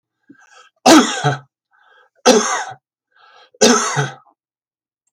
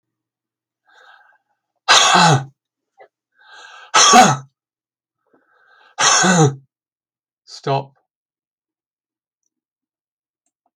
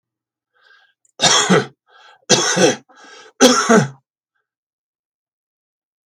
{"cough_length": "5.1 s", "cough_amplitude": 32768, "cough_signal_mean_std_ratio": 0.37, "exhalation_length": "10.8 s", "exhalation_amplitude": 32768, "exhalation_signal_mean_std_ratio": 0.32, "three_cough_length": "6.1 s", "three_cough_amplitude": 32768, "three_cough_signal_mean_std_ratio": 0.37, "survey_phase": "beta (2021-08-13 to 2022-03-07)", "age": "65+", "gender": "Male", "wearing_mask": "No", "symptom_sore_throat": true, "smoker_status": "Ex-smoker", "respiratory_condition_asthma": false, "respiratory_condition_other": false, "recruitment_source": "Test and Trace", "submission_delay": "1 day", "covid_test_result": "Negative", "covid_test_method": "RT-qPCR"}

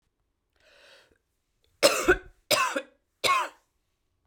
{"three_cough_length": "4.3 s", "three_cough_amplitude": 20726, "three_cough_signal_mean_std_ratio": 0.33, "survey_phase": "beta (2021-08-13 to 2022-03-07)", "age": "45-64", "gender": "Female", "wearing_mask": "No", "symptom_cough_any": true, "symptom_shortness_of_breath": true, "symptom_fatigue": true, "symptom_headache": true, "smoker_status": "Never smoked", "respiratory_condition_asthma": true, "respiratory_condition_other": false, "recruitment_source": "Test and Trace", "submission_delay": "2 days", "covid_test_result": "Positive", "covid_test_method": "RT-qPCR", "covid_ct_value": 20.2, "covid_ct_gene": "ORF1ab gene", "covid_ct_mean": 20.6, "covid_viral_load": "170000 copies/ml", "covid_viral_load_category": "Low viral load (10K-1M copies/ml)"}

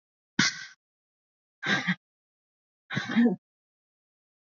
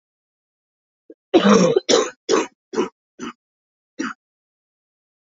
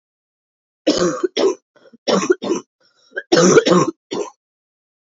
{"exhalation_length": "4.4 s", "exhalation_amplitude": 11669, "exhalation_signal_mean_std_ratio": 0.33, "cough_length": "5.3 s", "cough_amplitude": 27726, "cough_signal_mean_std_ratio": 0.34, "three_cough_length": "5.1 s", "three_cough_amplitude": 32768, "three_cough_signal_mean_std_ratio": 0.45, "survey_phase": "beta (2021-08-13 to 2022-03-07)", "age": "18-44", "gender": "Female", "wearing_mask": "No", "symptom_cough_any": true, "symptom_runny_or_blocked_nose": true, "symptom_shortness_of_breath": true, "symptom_fatigue": true, "symptom_headache": true, "symptom_change_to_sense_of_smell_or_taste": true, "smoker_status": "Never smoked", "respiratory_condition_asthma": false, "respiratory_condition_other": false, "recruitment_source": "Test and Trace", "submission_delay": "2 days", "covid_test_result": "Positive", "covid_test_method": "RT-qPCR"}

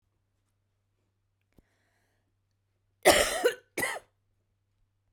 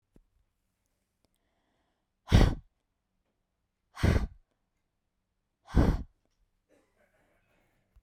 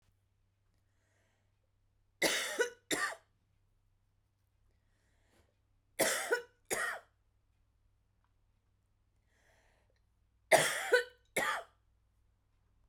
{"cough_length": "5.1 s", "cough_amplitude": 17668, "cough_signal_mean_std_ratio": 0.24, "exhalation_length": "8.0 s", "exhalation_amplitude": 13328, "exhalation_signal_mean_std_ratio": 0.23, "three_cough_length": "12.9 s", "three_cough_amplitude": 8414, "three_cough_signal_mean_std_ratio": 0.29, "survey_phase": "beta (2021-08-13 to 2022-03-07)", "age": "18-44", "gender": "Female", "wearing_mask": "No", "symptom_cough_any": true, "symptom_new_continuous_cough": true, "symptom_runny_or_blocked_nose": true, "symptom_shortness_of_breath": true, "symptom_sore_throat": true, "symptom_fatigue": true, "symptom_fever_high_temperature": true, "symptom_onset": "3 days", "smoker_status": "Never smoked", "respiratory_condition_asthma": false, "respiratory_condition_other": false, "recruitment_source": "Test and Trace", "submission_delay": "1 day", "covid_test_result": "Positive", "covid_test_method": "RT-qPCR", "covid_ct_value": 27.2, "covid_ct_gene": "ORF1ab gene", "covid_ct_mean": 28.0, "covid_viral_load": "680 copies/ml", "covid_viral_load_category": "Minimal viral load (< 10K copies/ml)"}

